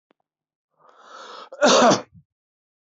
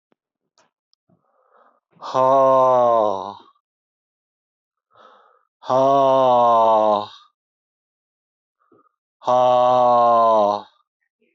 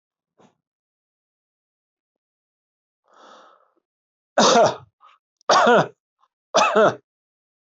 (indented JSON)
{
  "cough_length": "2.9 s",
  "cough_amplitude": 21187,
  "cough_signal_mean_std_ratio": 0.32,
  "exhalation_length": "11.3 s",
  "exhalation_amplitude": 18255,
  "exhalation_signal_mean_std_ratio": 0.53,
  "three_cough_length": "7.8 s",
  "three_cough_amplitude": 21704,
  "three_cough_signal_mean_std_ratio": 0.31,
  "survey_phase": "beta (2021-08-13 to 2022-03-07)",
  "age": "65+",
  "gender": "Male",
  "wearing_mask": "No",
  "symptom_none": true,
  "smoker_status": "Ex-smoker",
  "respiratory_condition_asthma": false,
  "respiratory_condition_other": false,
  "recruitment_source": "REACT",
  "submission_delay": "3 days",
  "covid_test_result": "Negative",
  "covid_test_method": "RT-qPCR"
}